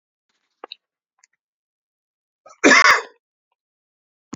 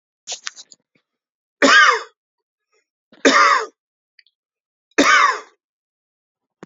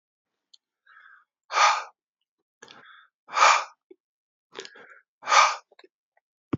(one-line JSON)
{"cough_length": "4.4 s", "cough_amplitude": 29736, "cough_signal_mean_std_ratio": 0.23, "three_cough_length": "6.7 s", "three_cough_amplitude": 28510, "three_cough_signal_mean_std_ratio": 0.34, "exhalation_length": "6.6 s", "exhalation_amplitude": 22550, "exhalation_signal_mean_std_ratio": 0.29, "survey_phase": "beta (2021-08-13 to 2022-03-07)", "age": "45-64", "gender": "Male", "wearing_mask": "No", "symptom_shortness_of_breath": true, "symptom_change_to_sense_of_smell_or_taste": true, "symptom_loss_of_taste": true, "symptom_onset": "5 days", "smoker_status": "Ex-smoker", "respiratory_condition_asthma": false, "respiratory_condition_other": false, "recruitment_source": "Test and Trace", "submission_delay": "1 day", "covid_test_result": "Positive", "covid_test_method": "RT-qPCR"}